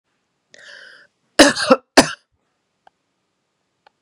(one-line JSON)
{"cough_length": "4.0 s", "cough_amplitude": 32768, "cough_signal_mean_std_ratio": 0.23, "survey_phase": "beta (2021-08-13 to 2022-03-07)", "age": "45-64", "gender": "Female", "wearing_mask": "No", "symptom_headache": true, "smoker_status": "Ex-smoker", "respiratory_condition_asthma": false, "respiratory_condition_other": false, "recruitment_source": "REACT", "submission_delay": "1 day", "covid_test_result": "Negative", "covid_test_method": "RT-qPCR", "influenza_a_test_result": "Negative", "influenza_b_test_result": "Negative"}